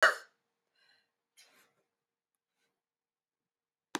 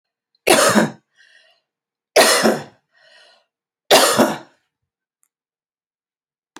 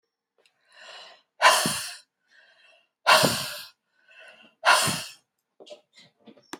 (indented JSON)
{
  "cough_length": "4.0 s",
  "cough_amplitude": 10974,
  "cough_signal_mean_std_ratio": 0.14,
  "three_cough_length": "6.6 s",
  "three_cough_amplitude": 32768,
  "three_cough_signal_mean_std_ratio": 0.35,
  "exhalation_length": "6.6 s",
  "exhalation_amplitude": 22951,
  "exhalation_signal_mean_std_ratio": 0.33,
  "survey_phase": "beta (2021-08-13 to 2022-03-07)",
  "age": "65+",
  "gender": "Female",
  "wearing_mask": "No",
  "symptom_none": true,
  "smoker_status": "Never smoked",
  "respiratory_condition_asthma": false,
  "respiratory_condition_other": false,
  "recruitment_source": "REACT",
  "submission_delay": "1 day",
  "covid_test_result": "Negative",
  "covid_test_method": "RT-qPCR"
}